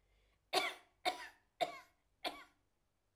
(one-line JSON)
{"cough_length": "3.2 s", "cough_amplitude": 4300, "cough_signal_mean_std_ratio": 0.33, "survey_phase": "alpha (2021-03-01 to 2021-08-12)", "age": "65+", "gender": "Female", "wearing_mask": "No", "symptom_none": true, "smoker_status": "Never smoked", "respiratory_condition_asthma": true, "respiratory_condition_other": false, "recruitment_source": "REACT", "submission_delay": "2 days", "covid_test_result": "Negative", "covid_test_method": "RT-qPCR"}